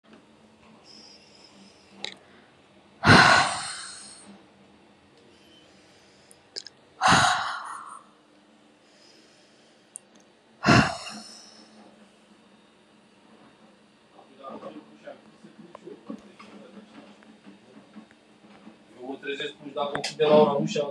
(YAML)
exhalation_length: 20.9 s
exhalation_amplitude: 25467
exhalation_signal_mean_std_ratio: 0.31
survey_phase: beta (2021-08-13 to 2022-03-07)
age: 18-44
gender: Female
wearing_mask: 'No'
symptom_cough_any: true
symptom_runny_or_blocked_nose: true
symptom_sore_throat: true
symptom_fever_high_temperature: true
symptom_headache: true
symptom_change_to_sense_of_smell_or_taste: true
smoker_status: Current smoker (1 to 10 cigarettes per day)
respiratory_condition_asthma: false
respiratory_condition_other: false
recruitment_source: Test and Trace
submission_delay: 1 day
covid_test_result: Positive
covid_test_method: ePCR